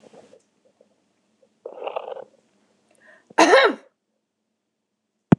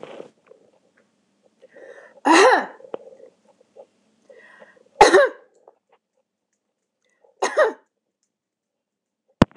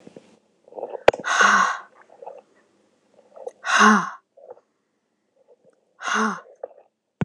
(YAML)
cough_length: 5.4 s
cough_amplitude: 26028
cough_signal_mean_std_ratio: 0.24
three_cough_length: 9.6 s
three_cough_amplitude: 26028
three_cough_signal_mean_std_ratio: 0.25
exhalation_length: 7.2 s
exhalation_amplitude: 26028
exhalation_signal_mean_std_ratio: 0.34
survey_phase: beta (2021-08-13 to 2022-03-07)
age: 45-64
gender: Female
wearing_mask: 'No'
symptom_none: true
symptom_onset: 12 days
smoker_status: Ex-smoker
respiratory_condition_asthma: false
respiratory_condition_other: false
recruitment_source: REACT
submission_delay: 1 day
covid_test_result: Negative
covid_test_method: RT-qPCR